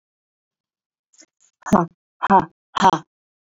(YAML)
exhalation_length: 3.5 s
exhalation_amplitude: 29418
exhalation_signal_mean_std_ratio: 0.28
survey_phase: beta (2021-08-13 to 2022-03-07)
age: 45-64
gender: Female
wearing_mask: 'No'
symptom_none: true
smoker_status: Ex-smoker
respiratory_condition_asthma: false
respiratory_condition_other: false
recruitment_source: REACT
submission_delay: 1 day
covid_test_result: Negative
covid_test_method: RT-qPCR
influenza_a_test_result: Negative
influenza_b_test_result: Negative